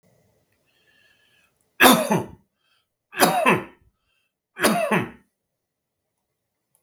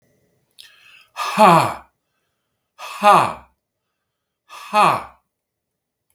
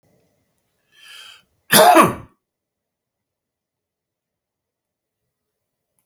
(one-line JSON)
{"three_cough_length": "6.8 s", "three_cough_amplitude": 32768, "three_cough_signal_mean_std_ratio": 0.32, "exhalation_length": "6.1 s", "exhalation_amplitude": 32766, "exhalation_signal_mean_std_ratio": 0.32, "cough_length": "6.1 s", "cough_amplitude": 32768, "cough_signal_mean_std_ratio": 0.21, "survey_phase": "beta (2021-08-13 to 2022-03-07)", "age": "45-64", "gender": "Male", "wearing_mask": "No", "symptom_none": true, "smoker_status": "Ex-smoker", "respiratory_condition_asthma": false, "respiratory_condition_other": false, "recruitment_source": "REACT", "submission_delay": "0 days", "covid_test_result": "Negative", "covid_test_method": "RT-qPCR"}